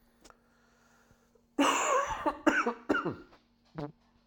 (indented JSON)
{
  "cough_length": "4.3 s",
  "cough_amplitude": 11037,
  "cough_signal_mean_std_ratio": 0.45,
  "survey_phase": "alpha (2021-03-01 to 2021-08-12)",
  "age": "45-64",
  "gender": "Male",
  "wearing_mask": "No",
  "symptom_cough_any": true,
  "symptom_fatigue": true,
  "symptom_change_to_sense_of_smell_or_taste": true,
  "symptom_loss_of_taste": true,
  "symptom_onset": "3 days",
  "smoker_status": "Never smoked",
  "respiratory_condition_asthma": false,
  "respiratory_condition_other": false,
  "recruitment_source": "Test and Trace",
  "submission_delay": "2 days",
  "covid_test_result": "Positive",
  "covid_test_method": "RT-qPCR"
}